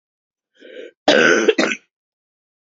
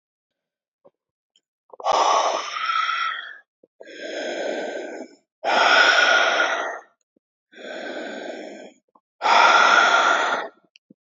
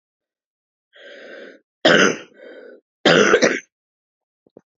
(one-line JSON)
{"cough_length": "2.7 s", "cough_amplitude": 28571, "cough_signal_mean_std_ratio": 0.38, "exhalation_length": "11.1 s", "exhalation_amplitude": 24718, "exhalation_signal_mean_std_ratio": 0.55, "three_cough_length": "4.8 s", "three_cough_amplitude": 31894, "three_cough_signal_mean_std_ratio": 0.34, "survey_phase": "beta (2021-08-13 to 2022-03-07)", "age": "18-44", "gender": "Female", "wearing_mask": "No", "symptom_cough_any": true, "symptom_runny_or_blocked_nose": true, "symptom_shortness_of_breath": true, "symptom_sore_throat": true, "symptom_abdominal_pain": true, "symptom_diarrhoea": true, "symptom_fatigue": true, "symptom_fever_high_temperature": true, "symptom_headache": true, "symptom_change_to_sense_of_smell_or_taste": true, "symptom_loss_of_taste": true, "symptom_onset": "3 days", "smoker_status": "Never smoked", "respiratory_condition_asthma": false, "respiratory_condition_other": false, "recruitment_source": "Test and Trace", "submission_delay": "2 days", "covid_test_result": "Positive", "covid_test_method": "RT-qPCR"}